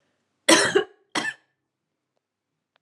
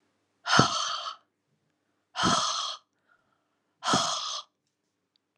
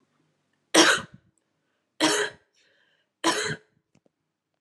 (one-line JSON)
{"cough_length": "2.8 s", "cough_amplitude": 27217, "cough_signal_mean_std_ratio": 0.3, "exhalation_length": "5.4 s", "exhalation_amplitude": 20742, "exhalation_signal_mean_std_ratio": 0.42, "three_cough_length": "4.6 s", "three_cough_amplitude": 30235, "three_cough_signal_mean_std_ratio": 0.31, "survey_phase": "alpha (2021-03-01 to 2021-08-12)", "age": "18-44", "gender": "Female", "wearing_mask": "No", "symptom_cough_any": true, "symptom_shortness_of_breath": true, "symptom_fatigue": true, "symptom_headache": true, "smoker_status": "Ex-smoker", "respiratory_condition_asthma": false, "respiratory_condition_other": false, "recruitment_source": "Test and Trace", "submission_delay": "2 days", "covid_test_result": "Positive", "covid_test_method": "RT-qPCR", "covid_ct_value": 16.6, "covid_ct_gene": "N gene", "covid_ct_mean": 16.6, "covid_viral_load": "3600000 copies/ml", "covid_viral_load_category": "High viral load (>1M copies/ml)"}